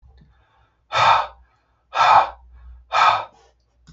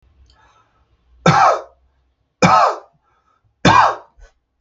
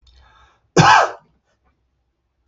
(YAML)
exhalation_length: 3.9 s
exhalation_amplitude: 26121
exhalation_signal_mean_std_ratio: 0.41
three_cough_length: 4.6 s
three_cough_amplitude: 32768
three_cough_signal_mean_std_ratio: 0.38
cough_length: 2.5 s
cough_amplitude: 32768
cough_signal_mean_std_ratio: 0.3
survey_phase: beta (2021-08-13 to 2022-03-07)
age: 45-64
gender: Male
wearing_mask: 'No'
symptom_none: true
smoker_status: Ex-smoker
respiratory_condition_asthma: false
respiratory_condition_other: false
recruitment_source: REACT
submission_delay: 5 days
covid_test_result: Negative
covid_test_method: RT-qPCR
influenza_a_test_result: Negative
influenza_b_test_result: Negative